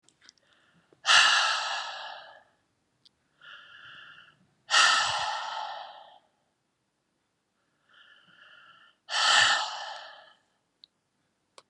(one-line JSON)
{"exhalation_length": "11.7 s", "exhalation_amplitude": 13772, "exhalation_signal_mean_std_ratio": 0.37, "survey_phase": "beta (2021-08-13 to 2022-03-07)", "age": "65+", "gender": "Female", "wearing_mask": "No", "symptom_cough_any": true, "symptom_headache": true, "symptom_onset": "12 days", "smoker_status": "Never smoked", "respiratory_condition_asthma": false, "respiratory_condition_other": false, "recruitment_source": "REACT", "submission_delay": "2 days", "covid_test_result": "Negative", "covid_test_method": "RT-qPCR", "influenza_a_test_result": "Negative", "influenza_b_test_result": "Negative"}